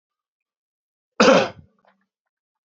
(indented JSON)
{
  "cough_length": "2.6 s",
  "cough_amplitude": 28591,
  "cough_signal_mean_std_ratio": 0.25,
  "survey_phase": "beta (2021-08-13 to 2022-03-07)",
  "age": "65+",
  "gender": "Male",
  "wearing_mask": "No",
  "symptom_runny_or_blocked_nose": true,
  "symptom_headache": true,
  "symptom_change_to_sense_of_smell_or_taste": true,
  "symptom_other": true,
  "symptom_onset": "5 days",
  "smoker_status": "Never smoked",
  "respiratory_condition_asthma": false,
  "respiratory_condition_other": false,
  "recruitment_source": "Test and Trace",
  "submission_delay": "2 days",
  "covid_test_result": "Positive",
  "covid_test_method": "RT-qPCR",
  "covid_ct_value": 14.5,
  "covid_ct_gene": "N gene",
  "covid_ct_mean": 14.6,
  "covid_viral_load": "16000000 copies/ml",
  "covid_viral_load_category": "High viral load (>1M copies/ml)"
}